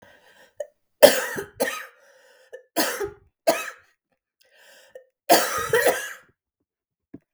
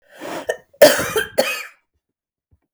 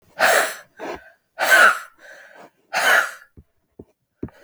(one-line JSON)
{"three_cough_length": "7.3 s", "three_cough_amplitude": 32768, "three_cough_signal_mean_std_ratio": 0.32, "cough_length": "2.7 s", "cough_amplitude": 32766, "cough_signal_mean_std_ratio": 0.35, "exhalation_length": "4.4 s", "exhalation_amplitude": 32766, "exhalation_signal_mean_std_ratio": 0.42, "survey_phase": "beta (2021-08-13 to 2022-03-07)", "age": "45-64", "gender": "Female", "wearing_mask": "No", "symptom_cough_any": true, "symptom_shortness_of_breath": true, "symptom_onset": "12 days", "smoker_status": "Never smoked", "respiratory_condition_asthma": true, "respiratory_condition_other": false, "recruitment_source": "REACT", "submission_delay": "0 days", "covid_test_result": "Positive", "covid_test_method": "RT-qPCR", "covid_ct_value": 32.0, "covid_ct_gene": "E gene", "influenza_a_test_result": "Negative", "influenza_b_test_result": "Negative"}